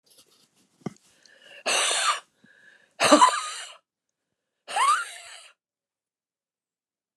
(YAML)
exhalation_length: 7.2 s
exhalation_amplitude: 27881
exhalation_signal_mean_std_ratio: 0.33
survey_phase: alpha (2021-03-01 to 2021-08-12)
age: 65+
gender: Female
wearing_mask: 'No'
symptom_none: true
smoker_status: Ex-smoker
respiratory_condition_asthma: true
respiratory_condition_other: false
recruitment_source: REACT
submission_delay: 2 days
covid_test_result: Negative
covid_test_method: RT-qPCR